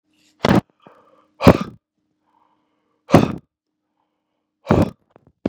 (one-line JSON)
{"exhalation_length": "5.5 s", "exhalation_amplitude": 32768, "exhalation_signal_mean_std_ratio": 0.24, "survey_phase": "beta (2021-08-13 to 2022-03-07)", "age": "18-44", "gender": "Male", "wearing_mask": "No", "symptom_none": true, "smoker_status": "Ex-smoker", "respiratory_condition_asthma": false, "respiratory_condition_other": false, "recruitment_source": "REACT", "submission_delay": "2 days", "covid_test_result": "Negative", "covid_test_method": "RT-qPCR", "influenza_a_test_result": "Negative", "influenza_b_test_result": "Negative"}